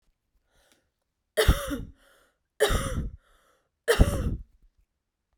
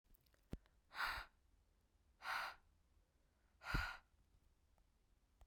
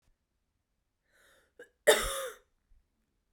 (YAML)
three_cough_length: 5.4 s
three_cough_amplitude: 17760
three_cough_signal_mean_std_ratio: 0.35
exhalation_length: 5.5 s
exhalation_amplitude: 1305
exhalation_signal_mean_std_ratio: 0.37
cough_length: 3.3 s
cough_amplitude: 12976
cough_signal_mean_std_ratio: 0.22
survey_phase: beta (2021-08-13 to 2022-03-07)
age: 18-44
gender: Female
wearing_mask: 'No'
symptom_runny_or_blocked_nose: true
symptom_shortness_of_breath: true
symptom_sore_throat: true
smoker_status: Ex-smoker
respiratory_condition_asthma: false
respiratory_condition_other: false
recruitment_source: Test and Trace
submission_delay: 2 days
covid_test_result: Positive
covid_test_method: RT-qPCR